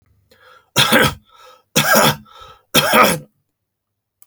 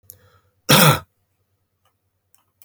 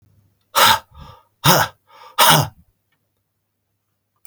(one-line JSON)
{"three_cough_length": "4.3 s", "three_cough_amplitude": 32768, "three_cough_signal_mean_std_ratio": 0.44, "cough_length": "2.6 s", "cough_amplitude": 32768, "cough_signal_mean_std_ratio": 0.27, "exhalation_length": "4.3 s", "exhalation_amplitude": 32768, "exhalation_signal_mean_std_ratio": 0.34, "survey_phase": "beta (2021-08-13 to 2022-03-07)", "age": "45-64", "gender": "Male", "wearing_mask": "No", "symptom_none": true, "smoker_status": "Never smoked", "respiratory_condition_asthma": false, "respiratory_condition_other": false, "recruitment_source": "REACT", "submission_delay": "3 days", "covid_test_result": "Negative", "covid_test_method": "RT-qPCR"}